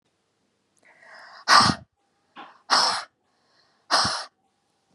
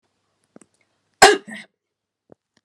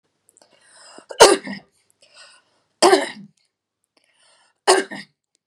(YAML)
exhalation_length: 4.9 s
exhalation_amplitude: 29075
exhalation_signal_mean_std_ratio: 0.32
cough_length: 2.6 s
cough_amplitude: 32768
cough_signal_mean_std_ratio: 0.19
three_cough_length: 5.5 s
three_cough_amplitude: 32768
three_cough_signal_mean_std_ratio: 0.26
survey_phase: beta (2021-08-13 to 2022-03-07)
age: 18-44
gender: Female
wearing_mask: 'No'
symptom_none: true
smoker_status: Never smoked
respiratory_condition_asthma: false
respiratory_condition_other: false
recruitment_source: REACT
submission_delay: 3 days
covid_test_result: Negative
covid_test_method: RT-qPCR